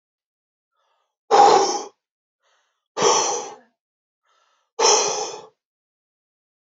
{"exhalation_length": "6.7 s", "exhalation_amplitude": 27839, "exhalation_signal_mean_std_ratio": 0.35, "survey_phase": "beta (2021-08-13 to 2022-03-07)", "age": "45-64", "gender": "Male", "wearing_mask": "No", "symptom_headache": true, "symptom_other": true, "symptom_onset": "5 days", "smoker_status": "Never smoked", "respiratory_condition_asthma": true, "respiratory_condition_other": false, "recruitment_source": "Test and Trace", "submission_delay": "2 days", "covid_test_result": "Positive", "covid_test_method": "RT-qPCR", "covid_ct_value": 28.6, "covid_ct_gene": "N gene"}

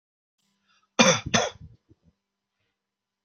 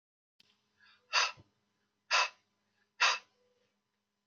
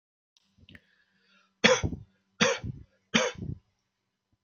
{"cough_length": "3.2 s", "cough_amplitude": 25412, "cough_signal_mean_std_ratio": 0.26, "exhalation_length": "4.3 s", "exhalation_amplitude": 6098, "exhalation_signal_mean_std_ratio": 0.27, "three_cough_length": "4.4 s", "three_cough_amplitude": 23472, "three_cough_signal_mean_std_ratio": 0.31, "survey_phase": "beta (2021-08-13 to 2022-03-07)", "age": "65+", "gender": "Male", "wearing_mask": "No", "symptom_none": true, "smoker_status": "Never smoked", "respiratory_condition_asthma": false, "respiratory_condition_other": false, "recruitment_source": "REACT", "submission_delay": "1 day", "covid_test_result": "Negative", "covid_test_method": "RT-qPCR"}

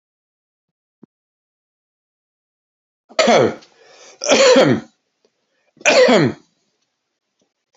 {"three_cough_length": "7.8 s", "three_cough_amplitude": 31891, "three_cough_signal_mean_std_ratio": 0.35, "survey_phase": "beta (2021-08-13 to 2022-03-07)", "age": "45-64", "gender": "Male", "wearing_mask": "No", "symptom_none": true, "smoker_status": "Current smoker (11 or more cigarettes per day)", "respiratory_condition_asthma": false, "respiratory_condition_other": false, "recruitment_source": "REACT", "submission_delay": "2 days", "covid_test_result": "Negative", "covid_test_method": "RT-qPCR"}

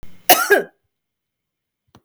{"cough_length": "2.0 s", "cough_amplitude": 32768, "cough_signal_mean_std_ratio": 0.3, "survey_phase": "beta (2021-08-13 to 2022-03-07)", "age": "45-64", "gender": "Female", "wearing_mask": "No", "symptom_none": true, "smoker_status": "Never smoked", "respiratory_condition_asthma": false, "respiratory_condition_other": false, "recruitment_source": "REACT", "submission_delay": "2 days", "covid_test_result": "Negative", "covid_test_method": "RT-qPCR"}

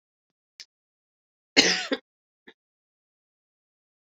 {"cough_length": "4.0 s", "cough_amplitude": 23557, "cough_signal_mean_std_ratio": 0.2, "survey_phase": "beta (2021-08-13 to 2022-03-07)", "age": "45-64", "gender": "Female", "wearing_mask": "No", "symptom_cough_any": true, "symptom_runny_or_blocked_nose": true, "symptom_fatigue": true, "symptom_headache": true, "symptom_onset": "3 days", "smoker_status": "Never smoked", "respiratory_condition_asthma": false, "respiratory_condition_other": false, "recruitment_source": "Test and Trace", "submission_delay": "1 day", "covid_test_result": "Positive", "covid_test_method": "RT-qPCR", "covid_ct_value": 35.9, "covid_ct_gene": "N gene"}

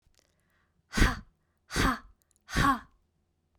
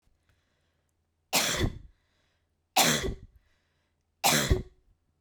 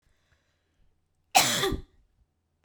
{"exhalation_length": "3.6 s", "exhalation_amplitude": 10767, "exhalation_signal_mean_std_ratio": 0.35, "three_cough_length": "5.2 s", "three_cough_amplitude": 13458, "three_cough_signal_mean_std_ratio": 0.37, "cough_length": "2.6 s", "cough_amplitude": 19585, "cough_signal_mean_std_ratio": 0.3, "survey_phase": "beta (2021-08-13 to 2022-03-07)", "age": "45-64", "gender": "Female", "wearing_mask": "No", "symptom_headache": true, "smoker_status": "Never smoked", "respiratory_condition_asthma": false, "respiratory_condition_other": false, "recruitment_source": "REACT", "submission_delay": "1 day", "covid_test_result": "Negative", "covid_test_method": "RT-qPCR", "influenza_a_test_result": "Negative", "influenza_b_test_result": "Negative"}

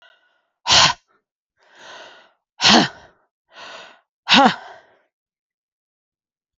{"exhalation_length": "6.6 s", "exhalation_amplitude": 32768, "exhalation_signal_mean_std_ratio": 0.29, "survey_phase": "alpha (2021-03-01 to 2021-08-12)", "age": "45-64", "gender": "Female", "wearing_mask": "No", "symptom_cough_any": true, "symptom_new_continuous_cough": true, "symptom_fatigue": true, "symptom_fever_high_temperature": true, "symptom_headache": true, "symptom_onset": "4 days", "smoker_status": "Never smoked", "respiratory_condition_asthma": false, "respiratory_condition_other": false, "recruitment_source": "Test and Trace", "submission_delay": "2 days", "covid_test_result": "Positive", "covid_test_method": "RT-qPCR"}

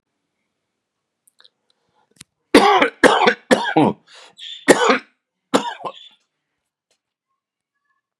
{"cough_length": "8.2 s", "cough_amplitude": 32768, "cough_signal_mean_std_ratio": 0.32, "survey_phase": "beta (2021-08-13 to 2022-03-07)", "age": "65+", "gender": "Male", "wearing_mask": "No", "symptom_none": true, "smoker_status": "Never smoked", "respiratory_condition_asthma": false, "respiratory_condition_other": false, "recruitment_source": "REACT", "submission_delay": "1 day", "covid_test_result": "Negative", "covid_test_method": "RT-qPCR"}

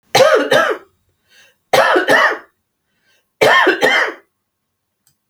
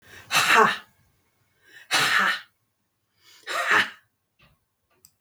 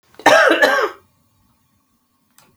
{"three_cough_length": "5.3 s", "three_cough_amplitude": 32768, "three_cough_signal_mean_std_ratio": 0.51, "exhalation_length": "5.2 s", "exhalation_amplitude": 20894, "exhalation_signal_mean_std_ratio": 0.4, "cough_length": "2.6 s", "cough_amplitude": 32768, "cough_signal_mean_std_ratio": 0.4, "survey_phase": "beta (2021-08-13 to 2022-03-07)", "age": "45-64", "gender": "Female", "wearing_mask": "No", "symptom_runny_or_blocked_nose": true, "symptom_headache": true, "symptom_change_to_sense_of_smell_or_taste": true, "symptom_onset": "5 days", "smoker_status": "Never smoked", "respiratory_condition_asthma": false, "respiratory_condition_other": false, "recruitment_source": "Test and Trace", "submission_delay": "3 days", "covid_test_result": "Negative", "covid_test_method": "RT-qPCR"}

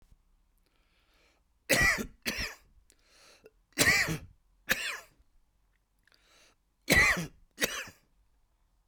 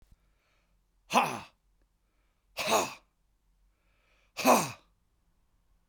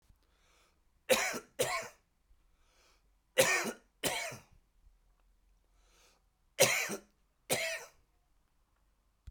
{"cough_length": "8.9 s", "cough_amplitude": 13208, "cough_signal_mean_std_ratio": 0.34, "exhalation_length": "5.9 s", "exhalation_amplitude": 11692, "exhalation_signal_mean_std_ratio": 0.28, "three_cough_length": "9.3 s", "three_cough_amplitude": 9523, "three_cough_signal_mean_std_ratio": 0.33, "survey_phase": "beta (2021-08-13 to 2022-03-07)", "age": "65+", "gender": "Male", "wearing_mask": "No", "symptom_none": true, "smoker_status": "Ex-smoker", "respiratory_condition_asthma": false, "respiratory_condition_other": false, "recruitment_source": "REACT", "submission_delay": "3 days", "covid_test_result": "Negative", "covid_test_method": "RT-qPCR", "influenza_a_test_result": "Negative", "influenza_b_test_result": "Negative"}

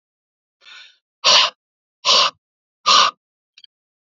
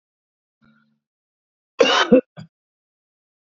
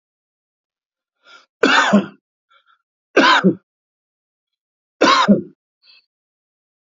{"exhalation_length": "4.0 s", "exhalation_amplitude": 32621, "exhalation_signal_mean_std_ratio": 0.35, "cough_length": "3.6 s", "cough_amplitude": 27619, "cough_signal_mean_std_ratio": 0.24, "three_cough_length": "7.0 s", "three_cough_amplitude": 29723, "three_cough_signal_mean_std_ratio": 0.33, "survey_phase": "beta (2021-08-13 to 2022-03-07)", "age": "45-64", "gender": "Male", "wearing_mask": "No", "symptom_none": true, "symptom_onset": "12 days", "smoker_status": "Never smoked", "respiratory_condition_asthma": false, "respiratory_condition_other": false, "recruitment_source": "REACT", "submission_delay": "1 day", "covid_test_result": "Negative", "covid_test_method": "RT-qPCR"}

